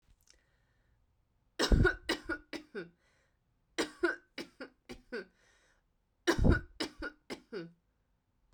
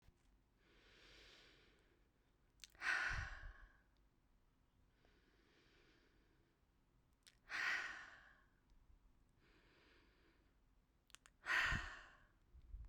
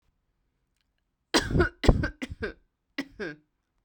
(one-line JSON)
{"three_cough_length": "8.5 s", "three_cough_amplitude": 8641, "three_cough_signal_mean_std_ratio": 0.32, "exhalation_length": "12.9 s", "exhalation_amplitude": 1330, "exhalation_signal_mean_std_ratio": 0.34, "cough_length": "3.8 s", "cough_amplitude": 20172, "cough_signal_mean_std_ratio": 0.32, "survey_phase": "beta (2021-08-13 to 2022-03-07)", "age": "18-44", "gender": "Female", "wearing_mask": "No", "symptom_none": true, "smoker_status": "Never smoked", "respiratory_condition_asthma": false, "respiratory_condition_other": false, "recruitment_source": "REACT", "submission_delay": "1 day", "covid_test_result": "Negative", "covid_test_method": "RT-qPCR"}